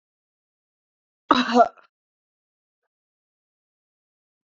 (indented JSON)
{
  "cough_length": "4.4 s",
  "cough_amplitude": 27710,
  "cough_signal_mean_std_ratio": 0.19,
  "survey_phase": "beta (2021-08-13 to 2022-03-07)",
  "age": "45-64",
  "gender": "Female",
  "wearing_mask": "No",
  "symptom_none": true,
  "smoker_status": "Never smoked",
  "respiratory_condition_asthma": false,
  "respiratory_condition_other": false,
  "recruitment_source": "REACT",
  "submission_delay": "3 days",
  "covid_test_result": "Negative",
  "covid_test_method": "RT-qPCR",
  "influenza_a_test_result": "Negative",
  "influenza_b_test_result": "Negative"
}